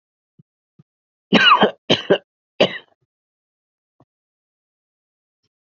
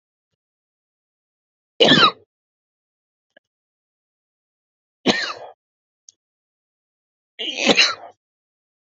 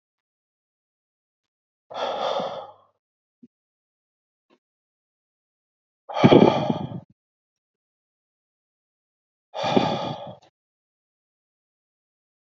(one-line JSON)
{"three_cough_length": "5.6 s", "three_cough_amplitude": 32768, "three_cough_signal_mean_std_ratio": 0.26, "cough_length": "8.9 s", "cough_amplitude": 29072, "cough_signal_mean_std_ratio": 0.24, "exhalation_length": "12.5 s", "exhalation_amplitude": 27385, "exhalation_signal_mean_std_ratio": 0.24, "survey_phase": "beta (2021-08-13 to 2022-03-07)", "age": "18-44", "gender": "Male", "wearing_mask": "No", "symptom_runny_or_blocked_nose": true, "symptom_shortness_of_breath": true, "symptom_diarrhoea": true, "symptom_fatigue": true, "symptom_onset": "13 days", "smoker_status": "Ex-smoker", "respiratory_condition_asthma": false, "respiratory_condition_other": false, "recruitment_source": "REACT", "submission_delay": "5 days", "covid_test_result": "Negative", "covid_test_method": "RT-qPCR", "influenza_a_test_result": "Negative", "influenza_b_test_result": "Negative"}